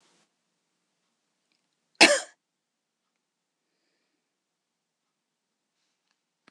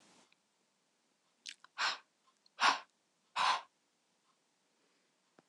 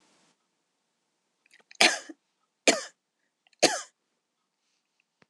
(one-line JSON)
{"cough_length": "6.5 s", "cough_amplitude": 24911, "cough_signal_mean_std_ratio": 0.12, "exhalation_length": "5.5 s", "exhalation_amplitude": 5594, "exhalation_signal_mean_std_ratio": 0.26, "three_cough_length": "5.3 s", "three_cough_amplitude": 26027, "three_cough_signal_mean_std_ratio": 0.2, "survey_phase": "beta (2021-08-13 to 2022-03-07)", "age": "18-44", "gender": "Female", "wearing_mask": "No", "symptom_cough_any": true, "symptom_runny_or_blocked_nose": true, "symptom_onset": "4 days", "smoker_status": "Never smoked", "respiratory_condition_asthma": false, "respiratory_condition_other": false, "recruitment_source": "REACT", "submission_delay": "1 day", "covid_test_result": "Positive", "covid_test_method": "RT-qPCR", "covid_ct_value": 34.0, "covid_ct_gene": "E gene", "influenza_a_test_result": "Negative", "influenza_b_test_result": "Negative"}